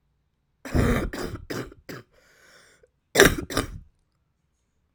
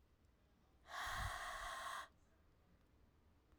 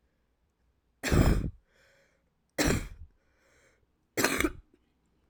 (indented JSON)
{
  "cough_length": "4.9 s",
  "cough_amplitude": 32768,
  "cough_signal_mean_std_ratio": 0.33,
  "exhalation_length": "3.6 s",
  "exhalation_amplitude": 685,
  "exhalation_signal_mean_std_ratio": 0.56,
  "three_cough_length": "5.3 s",
  "three_cough_amplitude": 15011,
  "three_cough_signal_mean_std_ratio": 0.35,
  "survey_phase": "alpha (2021-03-01 to 2021-08-12)",
  "age": "18-44",
  "gender": "Female",
  "wearing_mask": "Yes",
  "symptom_cough_any": true,
  "symptom_new_continuous_cough": true,
  "symptom_shortness_of_breath": true,
  "symptom_abdominal_pain": true,
  "symptom_fatigue": true,
  "symptom_fever_high_temperature": true,
  "symptom_headache": true,
  "symptom_change_to_sense_of_smell_or_taste": true,
  "symptom_onset": "3 days",
  "smoker_status": "Never smoked",
  "respiratory_condition_asthma": false,
  "respiratory_condition_other": false,
  "recruitment_source": "Test and Trace",
  "submission_delay": "2 days",
  "covid_test_result": "Positive",
  "covid_test_method": "RT-qPCR"
}